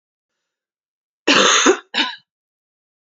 {"cough_length": "3.2 s", "cough_amplitude": 32767, "cough_signal_mean_std_ratio": 0.36, "survey_phase": "beta (2021-08-13 to 2022-03-07)", "age": "18-44", "gender": "Female", "wearing_mask": "No", "symptom_cough_any": true, "symptom_new_continuous_cough": true, "symptom_runny_or_blocked_nose": true, "symptom_sore_throat": true, "symptom_fever_high_temperature": true, "symptom_headache": true, "symptom_other": true, "smoker_status": "Never smoked", "respiratory_condition_asthma": false, "respiratory_condition_other": false, "recruitment_source": "Test and Trace", "submission_delay": "1 day", "covid_test_result": "Positive", "covid_test_method": "LFT"}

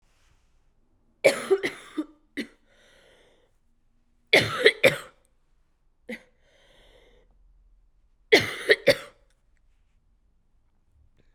{"three_cough_length": "11.3 s", "three_cough_amplitude": 28802, "three_cough_signal_mean_std_ratio": 0.25, "survey_phase": "beta (2021-08-13 to 2022-03-07)", "age": "18-44", "gender": "Female", "wearing_mask": "No", "symptom_new_continuous_cough": true, "symptom_runny_or_blocked_nose": true, "symptom_fatigue": true, "symptom_headache": true, "symptom_other": true, "symptom_onset": "3 days", "smoker_status": "Never smoked", "respiratory_condition_asthma": false, "respiratory_condition_other": false, "recruitment_source": "Test and Trace", "submission_delay": "2 days", "covid_test_result": "Positive", "covid_test_method": "RT-qPCR", "covid_ct_value": 19.8, "covid_ct_gene": "N gene", "covid_ct_mean": 19.8, "covid_viral_load": "320000 copies/ml", "covid_viral_load_category": "Low viral load (10K-1M copies/ml)"}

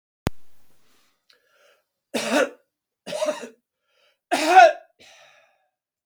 {"three_cough_length": "6.1 s", "three_cough_amplitude": 32587, "three_cough_signal_mean_std_ratio": 0.29, "survey_phase": "beta (2021-08-13 to 2022-03-07)", "age": "65+", "gender": "Male", "wearing_mask": "No", "symptom_none": true, "smoker_status": "Never smoked", "respiratory_condition_asthma": false, "respiratory_condition_other": false, "recruitment_source": "REACT", "submission_delay": "1 day", "covid_test_result": "Negative", "covid_test_method": "RT-qPCR"}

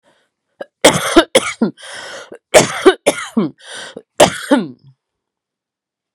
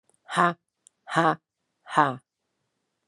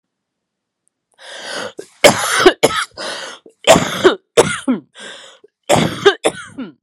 {"cough_length": "6.1 s", "cough_amplitude": 32768, "cough_signal_mean_std_ratio": 0.37, "exhalation_length": "3.1 s", "exhalation_amplitude": 20013, "exhalation_signal_mean_std_ratio": 0.31, "three_cough_length": "6.8 s", "three_cough_amplitude": 32768, "three_cough_signal_mean_std_ratio": 0.42, "survey_phase": "alpha (2021-03-01 to 2021-08-12)", "age": "45-64", "gender": "Female", "wearing_mask": "No", "symptom_cough_any": true, "symptom_new_continuous_cough": true, "symptom_shortness_of_breath": true, "symptom_fatigue": true, "symptom_headache": true, "symptom_change_to_sense_of_smell_or_taste": true, "symptom_loss_of_taste": true, "symptom_onset": "5 days", "smoker_status": "Ex-smoker", "respiratory_condition_asthma": false, "respiratory_condition_other": false, "recruitment_source": "Test and Trace", "submission_delay": "1 day", "covid_test_result": "Positive", "covid_test_method": "RT-qPCR"}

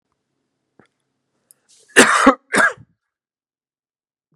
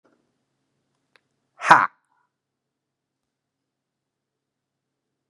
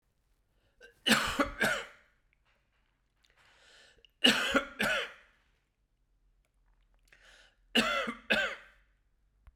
{"cough_length": "4.4 s", "cough_amplitude": 32768, "cough_signal_mean_std_ratio": 0.27, "exhalation_length": "5.3 s", "exhalation_amplitude": 32768, "exhalation_signal_mean_std_ratio": 0.13, "three_cough_length": "9.6 s", "three_cough_amplitude": 11990, "three_cough_signal_mean_std_ratio": 0.35, "survey_phase": "beta (2021-08-13 to 2022-03-07)", "age": "45-64", "gender": "Male", "wearing_mask": "No", "symptom_cough_any": true, "symptom_change_to_sense_of_smell_or_taste": true, "symptom_loss_of_taste": true, "symptom_onset": "4 days", "smoker_status": "Ex-smoker", "respiratory_condition_asthma": false, "respiratory_condition_other": false, "recruitment_source": "Test and Trace", "submission_delay": "2 days", "covid_test_result": "Positive", "covid_test_method": "RT-qPCR", "covid_ct_value": 25.1, "covid_ct_gene": "N gene"}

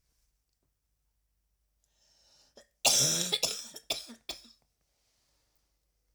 {"three_cough_length": "6.1 s", "three_cough_amplitude": 10300, "three_cough_signal_mean_std_ratio": 0.29, "survey_phase": "beta (2021-08-13 to 2022-03-07)", "age": "18-44", "gender": "Female", "wearing_mask": "No", "symptom_cough_any": true, "symptom_runny_or_blocked_nose": true, "symptom_shortness_of_breath": true, "symptom_sore_throat": true, "symptom_abdominal_pain": true, "symptom_fatigue": true, "symptom_headache": true, "symptom_change_to_sense_of_smell_or_taste": true, "symptom_loss_of_taste": true, "symptom_onset": "4 days", "smoker_status": "Never smoked", "respiratory_condition_asthma": false, "respiratory_condition_other": false, "recruitment_source": "Test and Trace", "submission_delay": "1 day", "covid_test_result": "Positive", "covid_test_method": "RT-qPCR"}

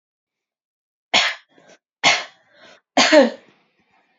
{"three_cough_length": "4.2 s", "three_cough_amplitude": 28918, "three_cough_signal_mean_std_ratio": 0.32, "survey_phase": "beta (2021-08-13 to 2022-03-07)", "age": "18-44", "gender": "Female", "wearing_mask": "No", "symptom_runny_or_blocked_nose": true, "smoker_status": "Never smoked", "respiratory_condition_asthma": false, "respiratory_condition_other": false, "recruitment_source": "REACT", "submission_delay": "1 day", "covid_test_result": "Negative", "covid_test_method": "RT-qPCR", "influenza_a_test_result": "Negative", "influenza_b_test_result": "Negative"}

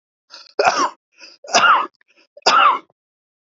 {"three_cough_length": "3.5 s", "three_cough_amplitude": 30709, "three_cough_signal_mean_std_ratio": 0.44, "survey_phase": "beta (2021-08-13 to 2022-03-07)", "age": "45-64", "gender": "Male", "wearing_mask": "No", "symptom_none": true, "smoker_status": "Ex-smoker", "respiratory_condition_asthma": false, "respiratory_condition_other": false, "recruitment_source": "REACT", "submission_delay": "2 days", "covid_test_result": "Negative", "covid_test_method": "RT-qPCR", "influenza_a_test_result": "Negative", "influenza_b_test_result": "Negative"}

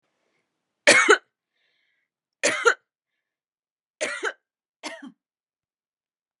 {"three_cough_length": "6.4 s", "three_cough_amplitude": 27899, "three_cough_signal_mean_std_ratio": 0.25, "survey_phase": "beta (2021-08-13 to 2022-03-07)", "age": "45-64", "gender": "Female", "wearing_mask": "No", "symptom_runny_or_blocked_nose": true, "smoker_status": "Never smoked", "respiratory_condition_asthma": false, "respiratory_condition_other": false, "recruitment_source": "REACT", "submission_delay": "2 days", "covid_test_result": "Negative", "covid_test_method": "RT-qPCR"}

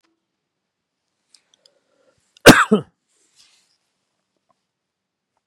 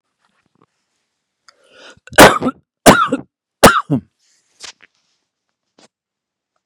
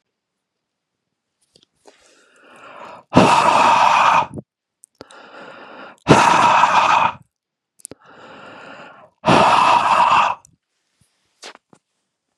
{"cough_length": "5.5 s", "cough_amplitude": 32768, "cough_signal_mean_std_ratio": 0.16, "three_cough_length": "6.7 s", "three_cough_amplitude": 32768, "three_cough_signal_mean_std_ratio": 0.26, "exhalation_length": "12.4 s", "exhalation_amplitude": 32768, "exhalation_signal_mean_std_ratio": 0.45, "survey_phase": "beta (2021-08-13 to 2022-03-07)", "age": "65+", "gender": "Male", "wearing_mask": "No", "symptom_diarrhoea": true, "smoker_status": "Never smoked", "respiratory_condition_asthma": false, "respiratory_condition_other": false, "recruitment_source": "Test and Trace", "submission_delay": "0 days", "covid_test_result": "Negative", "covid_test_method": "RT-qPCR"}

